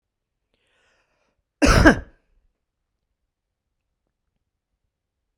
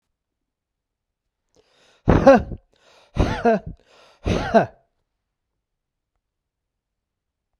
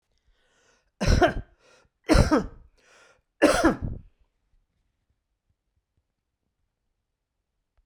cough_length: 5.4 s
cough_amplitude: 32768
cough_signal_mean_std_ratio: 0.2
exhalation_length: 7.6 s
exhalation_amplitude: 32768
exhalation_signal_mean_std_ratio: 0.28
three_cough_length: 7.9 s
three_cough_amplitude: 18019
three_cough_signal_mean_std_ratio: 0.29
survey_phase: beta (2021-08-13 to 2022-03-07)
age: 45-64
gender: Male
wearing_mask: 'No'
symptom_none: true
smoker_status: Never smoked
respiratory_condition_asthma: false
respiratory_condition_other: false
recruitment_source: REACT
submission_delay: 1 day
covid_test_result: Negative
covid_test_method: RT-qPCR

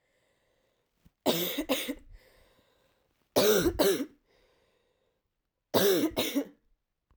three_cough_length: 7.2 s
three_cough_amplitude: 12402
three_cough_signal_mean_std_ratio: 0.41
survey_phase: alpha (2021-03-01 to 2021-08-12)
age: 18-44
gender: Female
wearing_mask: 'No'
symptom_cough_any: true
symptom_diarrhoea: true
symptom_fever_high_temperature: true
symptom_headache: true
symptom_change_to_sense_of_smell_or_taste: true
symptom_onset: 4 days
smoker_status: Ex-smoker
respiratory_condition_asthma: true
respiratory_condition_other: false
recruitment_source: Test and Trace
submission_delay: 2 days
covid_test_result: Positive
covid_test_method: RT-qPCR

